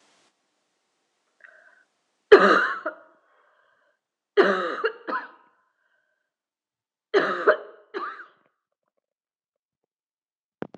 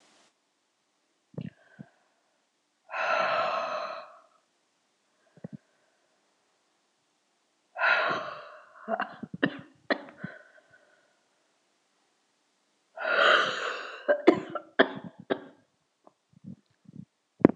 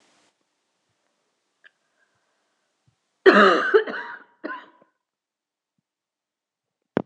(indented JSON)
{
  "three_cough_length": "10.8 s",
  "three_cough_amplitude": 26028,
  "three_cough_signal_mean_std_ratio": 0.26,
  "exhalation_length": "17.6 s",
  "exhalation_amplitude": 26028,
  "exhalation_signal_mean_std_ratio": 0.31,
  "cough_length": "7.1 s",
  "cough_amplitude": 26028,
  "cough_signal_mean_std_ratio": 0.24,
  "survey_phase": "beta (2021-08-13 to 2022-03-07)",
  "age": "45-64",
  "gender": "Female",
  "wearing_mask": "No",
  "symptom_cough_any": true,
  "symptom_sore_throat": true,
  "symptom_fatigue": true,
  "symptom_fever_high_temperature": true,
  "smoker_status": "Never smoked",
  "respiratory_condition_asthma": false,
  "respiratory_condition_other": false,
  "recruitment_source": "Test and Trace",
  "submission_delay": "1 day",
  "covid_test_result": "Positive",
  "covid_test_method": "ePCR"
}